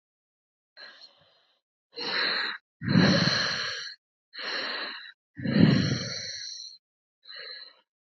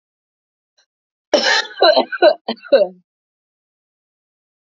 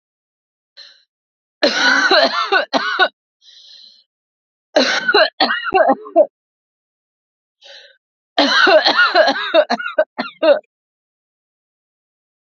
exhalation_length: 8.2 s
exhalation_amplitude: 17114
exhalation_signal_mean_std_ratio: 0.47
cough_length: 4.8 s
cough_amplitude: 32387
cough_signal_mean_std_ratio: 0.34
three_cough_length: 12.5 s
three_cough_amplitude: 32767
three_cough_signal_mean_std_ratio: 0.46
survey_phase: alpha (2021-03-01 to 2021-08-12)
age: 18-44
gender: Female
wearing_mask: 'No'
symptom_cough_any: true
symptom_new_continuous_cough: true
symptom_shortness_of_breath: true
symptom_fatigue: true
symptom_headache: true
symptom_change_to_sense_of_smell_or_taste: true
symptom_loss_of_taste: true
symptom_onset: 1 day
smoker_status: Ex-smoker
respiratory_condition_asthma: false
respiratory_condition_other: false
recruitment_source: Test and Trace
submission_delay: 0 days
covid_test_result: Positive
covid_test_method: RT-qPCR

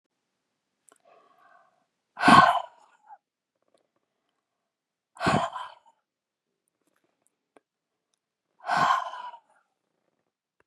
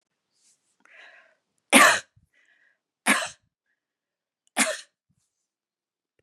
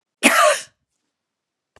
exhalation_length: 10.7 s
exhalation_amplitude: 25820
exhalation_signal_mean_std_ratio: 0.23
three_cough_length: 6.2 s
three_cough_amplitude: 31169
three_cough_signal_mean_std_ratio: 0.23
cough_length: 1.8 s
cough_amplitude: 32767
cough_signal_mean_std_ratio: 0.36
survey_phase: beta (2021-08-13 to 2022-03-07)
age: 65+
gender: Female
wearing_mask: 'No'
symptom_none: true
smoker_status: Never smoked
respiratory_condition_asthma: false
respiratory_condition_other: false
recruitment_source: REACT
submission_delay: 2 days
covid_test_result: Negative
covid_test_method: RT-qPCR
influenza_a_test_result: Negative
influenza_b_test_result: Negative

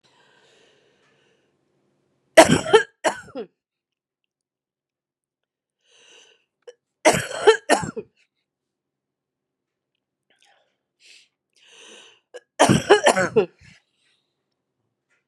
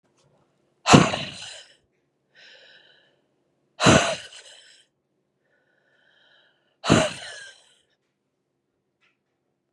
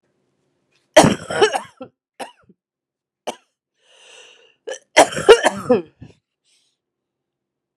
three_cough_length: 15.3 s
three_cough_amplitude: 32768
three_cough_signal_mean_std_ratio: 0.24
exhalation_length: 9.7 s
exhalation_amplitude: 32767
exhalation_signal_mean_std_ratio: 0.24
cough_length: 7.8 s
cough_amplitude: 32768
cough_signal_mean_std_ratio: 0.26
survey_phase: beta (2021-08-13 to 2022-03-07)
age: 45-64
gender: Female
wearing_mask: 'No'
symptom_cough_any: true
symptom_runny_or_blocked_nose: true
symptom_change_to_sense_of_smell_or_taste: true
symptom_onset: 5 days
smoker_status: Ex-smoker
respiratory_condition_asthma: false
respiratory_condition_other: false
recruitment_source: Test and Trace
submission_delay: 2 days
covid_test_result: Positive
covid_test_method: RT-qPCR
covid_ct_value: 17.0
covid_ct_gene: ORF1ab gene
covid_ct_mean: 17.4
covid_viral_load: 1900000 copies/ml
covid_viral_load_category: High viral load (>1M copies/ml)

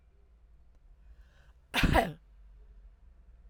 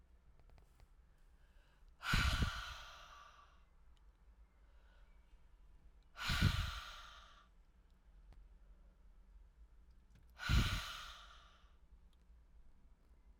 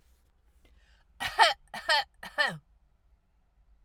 cough_length: 3.5 s
cough_amplitude: 8586
cough_signal_mean_std_ratio: 0.3
exhalation_length: 13.4 s
exhalation_amplitude: 2982
exhalation_signal_mean_std_ratio: 0.37
three_cough_length: 3.8 s
three_cough_amplitude: 16517
three_cough_signal_mean_std_ratio: 0.3
survey_phase: alpha (2021-03-01 to 2021-08-12)
age: 45-64
gender: Female
wearing_mask: 'No'
symptom_none: true
symptom_onset: 12 days
smoker_status: Ex-smoker
respiratory_condition_asthma: false
respiratory_condition_other: false
recruitment_source: REACT
submission_delay: 1 day
covid_test_result: Negative
covid_test_method: RT-qPCR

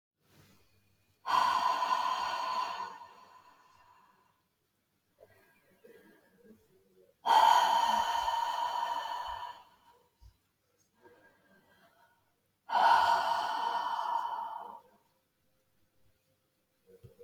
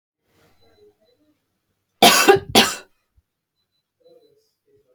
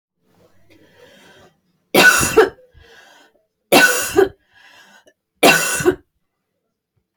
exhalation_length: 17.2 s
exhalation_amplitude: 7419
exhalation_signal_mean_std_ratio: 0.46
cough_length: 4.9 s
cough_amplitude: 32631
cough_signal_mean_std_ratio: 0.26
three_cough_length: 7.2 s
three_cough_amplitude: 32767
three_cough_signal_mean_std_ratio: 0.36
survey_phase: beta (2021-08-13 to 2022-03-07)
age: 45-64
gender: Female
wearing_mask: 'No'
symptom_none: true
smoker_status: Never smoked
respiratory_condition_asthma: false
respiratory_condition_other: false
recruitment_source: REACT
submission_delay: 15 days
covid_test_result: Negative
covid_test_method: RT-qPCR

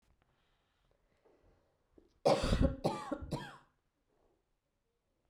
three_cough_length: 5.3 s
three_cough_amplitude: 5354
three_cough_signal_mean_std_ratio: 0.31
survey_phase: beta (2021-08-13 to 2022-03-07)
age: 18-44
gender: Female
wearing_mask: 'No'
symptom_runny_or_blocked_nose: true
symptom_onset: 2 days
smoker_status: Never smoked
respiratory_condition_asthma: false
respiratory_condition_other: false
recruitment_source: Test and Trace
submission_delay: 1 day
covid_test_result: Positive
covid_test_method: RT-qPCR
covid_ct_value: 17.3
covid_ct_gene: ORF1ab gene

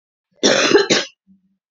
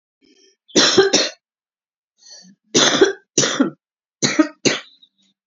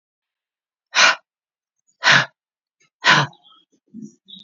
cough_length: 1.7 s
cough_amplitude: 30199
cough_signal_mean_std_ratio: 0.47
three_cough_length: 5.5 s
three_cough_amplitude: 32768
three_cough_signal_mean_std_ratio: 0.42
exhalation_length: 4.4 s
exhalation_amplitude: 30862
exhalation_signal_mean_std_ratio: 0.3
survey_phase: beta (2021-08-13 to 2022-03-07)
age: 45-64
gender: Female
wearing_mask: 'No'
symptom_fatigue: true
symptom_headache: true
symptom_onset: 6 days
smoker_status: Current smoker (1 to 10 cigarettes per day)
respiratory_condition_asthma: false
respiratory_condition_other: false
recruitment_source: REACT
submission_delay: 1 day
covid_test_result: Negative
covid_test_method: RT-qPCR
influenza_a_test_result: Negative
influenza_b_test_result: Negative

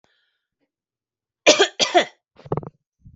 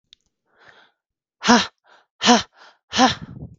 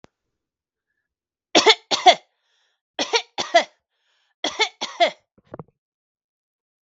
cough_length: 3.2 s
cough_amplitude: 32366
cough_signal_mean_std_ratio: 0.28
exhalation_length: 3.6 s
exhalation_amplitude: 32768
exhalation_signal_mean_std_ratio: 0.32
three_cough_length: 6.8 s
three_cough_amplitude: 32768
three_cough_signal_mean_std_ratio: 0.26
survey_phase: beta (2021-08-13 to 2022-03-07)
age: 18-44
gender: Female
wearing_mask: 'No'
symptom_cough_any: true
symptom_runny_or_blocked_nose: true
smoker_status: Ex-smoker
respiratory_condition_asthma: false
respiratory_condition_other: false
recruitment_source: REACT
submission_delay: 13 days
covid_test_result: Negative
covid_test_method: RT-qPCR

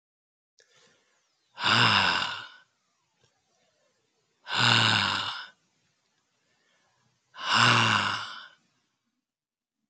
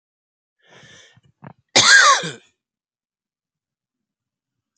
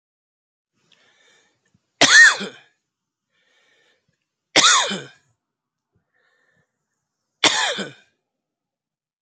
exhalation_length: 9.9 s
exhalation_amplitude: 16636
exhalation_signal_mean_std_ratio: 0.39
cough_length: 4.8 s
cough_amplitude: 31623
cough_signal_mean_std_ratio: 0.26
three_cough_length: 9.2 s
three_cough_amplitude: 31218
three_cough_signal_mean_std_ratio: 0.26
survey_phase: alpha (2021-03-01 to 2021-08-12)
age: 65+
gender: Male
wearing_mask: 'No'
symptom_none: true
smoker_status: Ex-smoker
respiratory_condition_asthma: false
respiratory_condition_other: false
recruitment_source: REACT
submission_delay: 1 day
covid_test_result: Negative
covid_test_method: RT-qPCR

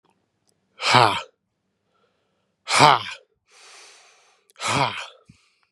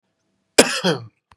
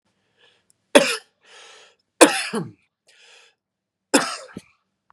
exhalation_length: 5.7 s
exhalation_amplitude: 32767
exhalation_signal_mean_std_ratio: 0.3
cough_length: 1.4 s
cough_amplitude: 32768
cough_signal_mean_std_ratio: 0.33
three_cough_length: 5.1 s
three_cough_amplitude: 32768
three_cough_signal_mean_std_ratio: 0.24
survey_phase: beta (2021-08-13 to 2022-03-07)
age: 45-64
gender: Male
wearing_mask: 'No'
symptom_cough_any: true
symptom_runny_or_blocked_nose: true
symptom_diarrhoea: true
symptom_onset: 4 days
smoker_status: Never smoked
respiratory_condition_asthma: false
respiratory_condition_other: false
recruitment_source: Test and Trace
submission_delay: 2 days
covid_test_result: Positive
covid_test_method: ePCR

